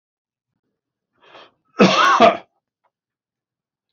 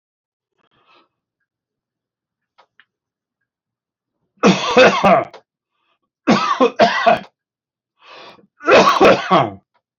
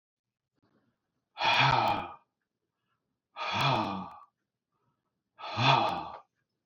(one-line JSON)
{"cough_length": "3.9 s", "cough_amplitude": 29283, "cough_signal_mean_std_ratio": 0.3, "three_cough_length": "10.0 s", "three_cough_amplitude": 29775, "three_cough_signal_mean_std_ratio": 0.38, "exhalation_length": "6.7 s", "exhalation_amplitude": 10863, "exhalation_signal_mean_std_ratio": 0.43, "survey_phase": "beta (2021-08-13 to 2022-03-07)", "age": "65+", "gender": "Male", "wearing_mask": "No", "symptom_cough_any": true, "smoker_status": "Never smoked", "respiratory_condition_asthma": false, "respiratory_condition_other": false, "recruitment_source": "Test and Trace", "submission_delay": "2 days", "covid_test_result": "Positive", "covid_test_method": "RT-qPCR", "covid_ct_value": 23.2, "covid_ct_gene": "ORF1ab gene", "covid_ct_mean": 23.6, "covid_viral_load": "17000 copies/ml", "covid_viral_load_category": "Low viral load (10K-1M copies/ml)"}